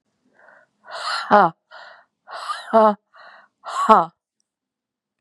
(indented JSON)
{
  "exhalation_length": "5.2 s",
  "exhalation_amplitude": 32767,
  "exhalation_signal_mean_std_ratio": 0.33,
  "survey_phase": "beta (2021-08-13 to 2022-03-07)",
  "age": "18-44",
  "gender": "Female",
  "wearing_mask": "No",
  "symptom_new_continuous_cough": true,
  "symptom_runny_or_blocked_nose": true,
  "symptom_sore_throat": true,
  "symptom_fatigue": true,
  "symptom_fever_high_temperature": true,
  "symptom_headache": true,
  "symptom_other": true,
  "symptom_onset": "3 days",
  "smoker_status": "Never smoked",
  "respiratory_condition_asthma": false,
  "respiratory_condition_other": false,
  "recruitment_source": "Test and Trace",
  "submission_delay": "1 day",
  "covid_test_result": "Positive",
  "covid_test_method": "RT-qPCR",
  "covid_ct_value": 22.1,
  "covid_ct_gene": "ORF1ab gene"
}